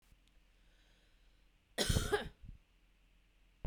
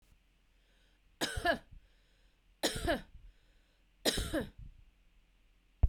cough_length: 3.7 s
cough_amplitude: 4176
cough_signal_mean_std_ratio: 0.32
three_cough_length: 5.9 s
three_cough_amplitude: 6173
three_cough_signal_mean_std_ratio: 0.34
survey_phase: beta (2021-08-13 to 2022-03-07)
age: 45-64
gender: Female
wearing_mask: 'No'
symptom_runny_or_blocked_nose: true
symptom_onset: 6 days
smoker_status: Ex-smoker
respiratory_condition_asthma: false
respiratory_condition_other: false
recruitment_source: REACT
submission_delay: 0 days
covid_test_result: Negative
covid_test_method: RT-qPCR
influenza_a_test_result: Negative
influenza_b_test_result: Negative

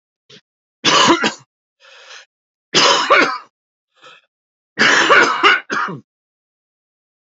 three_cough_length: 7.3 s
three_cough_amplitude: 32767
three_cough_signal_mean_std_ratio: 0.43
survey_phase: beta (2021-08-13 to 2022-03-07)
age: 45-64
gender: Male
wearing_mask: 'No'
symptom_cough_any: true
symptom_runny_or_blocked_nose: true
symptom_sore_throat: true
symptom_headache: true
symptom_onset: 5 days
smoker_status: Ex-smoker
respiratory_condition_asthma: false
respiratory_condition_other: false
recruitment_source: Test and Trace
submission_delay: 1 day
covid_test_result: Positive
covid_test_method: LAMP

